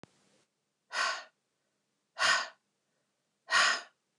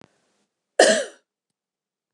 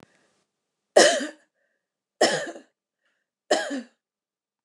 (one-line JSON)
{"exhalation_length": "4.2 s", "exhalation_amplitude": 7206, "exhalation_signal_mean_std_ratio": 0.35, "cough_length": "2.1 s", "cough_amplitude": 28777, "cough_signal_mean_std_ratio": 0.25, "three_cough_length": "4.6 s", "three_cough_amplitude": 25895, "three_cough_signal_mean_std_ratio": 0.29, "survey_phase": "alpha (2021-03-01 to 2021-08-12)", "age": "45-64", "gender": "Female", "wearing_mask": "No", "symptom_abdominal_pain": true, "symptom_headache": true, "smoker_status": "Ex-smoker", "respiratory_condition_asthma": false, "respiratory_condition_other": false, "recruitment_source": "REACT", "submission_delay": "10 days", "covid_test_result": "Negative", "covid_test_method": "RT-qPCR"}